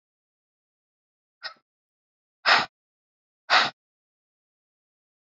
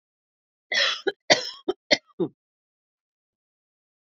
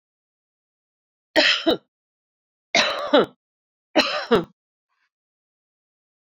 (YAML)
exhalation_length: 5.2 s
exhalation_amplitude: 19615
exhalation_signal_mean_std_ratio: 0.21
cough_length: 4.1 s
cough_amplitude: 27281
cough_signal_mean_std_ratio: 0.28
three_cough_length: 6.2 s
three_cough_amplitude: 25456
three_cough_signal_mean_std_ratio: 0.32
survey_phase: beta (2021-08-13 to 2022-03-07)
age: 45-64
gender: Female
wearing_mask: 'No'
symptom_fatigue: true
symptom_onset: 9 days
smoker_status: Ex-smoker
respiratory_condition_asthma: false
respiratory_condition_other: false
recruitment_source: REACT
submission_delay: 3 days
covid_test_result: Negative
covid_test_method: RT-qPCR